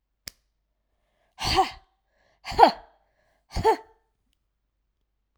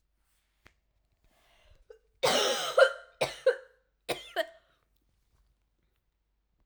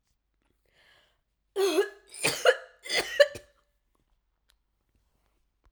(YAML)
exhalation_length: 5.4 s
exhalation_amplitude: 32543
exhalation_signal_mean_std_ratio: 0.24
cough_length: 6.7 s
cough_amplitude: 13501
cough_signal_mean_std_ratio: 0.29
three_cough_length: 5.7 s
three_cough_amplitude: 16395
three_cough_signal_mean_std_ratio: 0.29
survey_phase: alpha (2021-03-01 to 2021-08-12)
age: 18-44
gender: Female
wearing_mask: 'Yes'
symptom_cough_any: true
symptom_shortness_of_breath: true
symptom_fever_high_temperature: true
symptom_headache: true
symptom_change_to_sense_of_smell_or_taste: true
symptom_onset: 4 days
smoker_status: Never smoked
respiratory_condition_asthma: false
respiratory_condition_other: false
recruitment_source: Test and Trace
submission_delay: 1 day
covid_test_result: Positive
covid_test_method: RT-qPCR